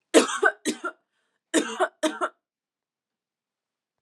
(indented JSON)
{
  "cough_length": "4.0 s",
  "cough_amplitude": 25098,
  "cough_signal_mean_std_ratio": 0.33,
  "survey_phase": "alpha (2021-03-01 to 2021-08-12)",
  "age": "18-44",
  "gender": "Female",
  "wearing_mask": "No",
  "symptom_fatigue": true,
  "symptom_headache": true,
  "symptom_onset": "3 days",
  "smoker_status": "Never smoked",
  "respiratory_condition_asthma": false,
  "respiratory_condition_other": false,
  "recruitment_source": "Test and Trace",
  "submission_delay": "1 day",
  "covid_test_result": "Positive",
  "covid_test_method": "RT-qPCR",
  "covid_ct_value": 13.9,
  "covid_ct_gene": "ORF1ab gene",
  "covid_ct_mean": 14.1,
  "covid_viral_load": "23000000 copies/ml",
  "covid_viral_load_category": "High viral load (>1M copies/ml)"
}